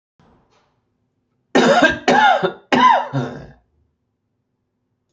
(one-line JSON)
{"three_cough_length": "5.1 s", "three_cough_amplitude": 29343, "three_cough_signal_mean_std_ratio": 0.42, "survey_phase": "beta (2021-08-13 to 2022-03-07)", "age": "65+", "gender": "Male", "wearing_mask": "No", "symptom_cough_any": true, "symptom_other": true, "smoker_status": "Ex-smoker", "respiratory_condition_asthma": false, "respiratory_condition_other": false, "recruitment_source": "Test and Trace", "submission_delay": "1 day", "covid_test_result": "Negative", "covid_test_method": "RT-qPCR"}